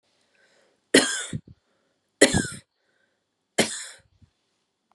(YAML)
three_cough_length: 4.9 s
three_cough_amplitude: 28777
three_cough_signal_mean_std_ratio: 0.26
survey_phase: beta (2021-08-13 to 2022-03-07)
age: 18-44
gender: Female
wearing_mask: 'No'
symptom_runny_or_blocked_nose: true
symptom_sore_throat: true
symptom_fatigue: true
symptom_headache: true
smoker_status: Never smoked
respiratory_condition_asthma: false
respiratory_condition_other: false
recruitment_source: REACT
submission_delay: 1 day
covid_test_result: Negative
covid_test_method: RT-qPCR
influenza_a_test_result: Negative
influenza_b_test_result: Negative